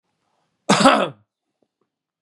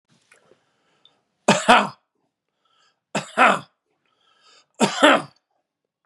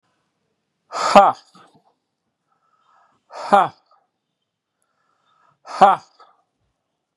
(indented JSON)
{
  "cough_length": "2.2 s",
  "cough_amplitude": 32767,
  "cough_signal_mean_std_ratio": 0.31,
  "three_cough_length": "6.1 s",
  "three_cough_amplitude": 32767,
  "three_cough_signal_mean_std_ratio": 0.29,
  "exhalation_length": "7.2 s",
  "exhalation_amplitude": 32768,
  "exhalation_signal_mean_std_ratio": 0.23,
  "survey_phase": "beta (2021-08-13 to 2022-03-07)",
  "age": "45-64",
  "gender": "Male",
  "wearing_mask": "No",
  "symptom_none": true,
  "smoker_status": "Never smoked",
  "respiratory_condition_asthma": false,
  "respiratory_condition_other": false,
  "recruitment_source": "REACT",
  "submission_delay": "1 day",
  "covid_test_result": "Negative",
  "covid_test_method": "RT-qPCR",
  "influenza_a_test_result": "Negative",
  "influenza_b_test_result": "Negative"
}